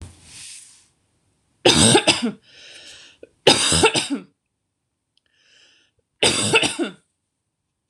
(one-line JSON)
{"three_cough_length": "7.9 s", "three_cough_amplitude": 26028, "three_cough_signal_mean_std_ratio": 0.38, "survey_phase": "beta (2021-08-13 to 2022-03-07)", "age": "18-44", "gender": "Female", "wearing_mask": "No", "symptom_none": true, "smoker_status": "Never smoked", "respiratory_condition_asthma": true, "respiratory_condition_other": false, "recruitment_source": "REACT", "submission_delay": "0 days", "covid_test_result": "Negative", "covid_test_method": "RT-qPCR", "influenza_a_test_result": "Negative", "influenza_b_test_result": "Negative"}